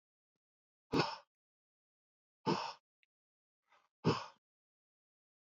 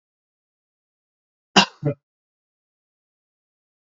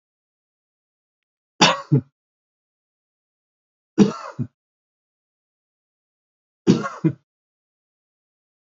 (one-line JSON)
{"exhalation_length": "5.5 s", "exhalation_amplitude": 3422, "exhalation_signal_mean_std_ratio": 0.25, "cough_length": "3.8 s", "cough_amplitude": 29785, "cough_signal_mean_std_ratio": 0.15, "three_cough_length": "8.7 s", "three_cough_amplitude": 31159, "three_cough_signal_mean_std_ratio": 0.21, "survey_phase": "alpha (2021-03-01 to 2021-08-12)", "age": "65+", "gender": "Male", "wearing_mask": "No", "symptom_none": true, "smoker_status": "Never smoked", "respiratory_condition_asthma": false, "respiratory_condition_other": false, "recruitment_source": "REACT", "submission_delay": "2 days", "covid_test_result": "Negative", "covid_test_method": "RT-qPCR"}